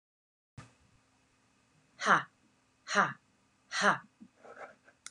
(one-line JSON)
{"exhalation_length": "5.1 s", "exhalation_amplitude": 8542, "exhalation_signal_mean_std_ratio": 0.28, "survey_phase": "beta (2021-08-13 to 2022-03-07)", "age": "45-64", "gender": "Female", "wearing_mask": "No", "symptom_sore_throat": true, "symptom_fatigue": true, "symptom_headache": true, "symptom_onset": "13 days", "smoker_status": "Never smoked", "respiratory_condition_asthma": false, "respiratory_condition_other": false, "recruitment_source": "REACT", "submission_delay": "1 day", "covid_test_result": "Negative", "covid_test_method": "RT-qPCR"}